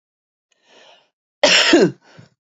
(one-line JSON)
{"cough_length": "2.6 s", "cough_amplitude": 28648, "cough_signal_mean_std_ratio": 0.36, "survey_phase": "beta (2021-08-13 to 2022-03-07)", "age": "18-44", "gender": "Female", "wearing_mask": "No", "symptom_cough_any": true, "symptom_runny_or_blocked_nose": true, "symptom_sore_throat": true, "symptom_fatigue": true, "symptom_fever_high_temperature": true, "symptom_headache": true, "symptom_onset": "3 days", "smoker_status": "Ex-smoker", "respiratory_condition_asthma": false, "respiratory_condition_other": false, "recruitment_source": "Test and Trace", "submission_delay": "1 day", "covid_test_result": "Positive", "covid_test_method": "RT-qPCR", "covid_ct_value": 16.9, "covid_ct_gene": "N gene"}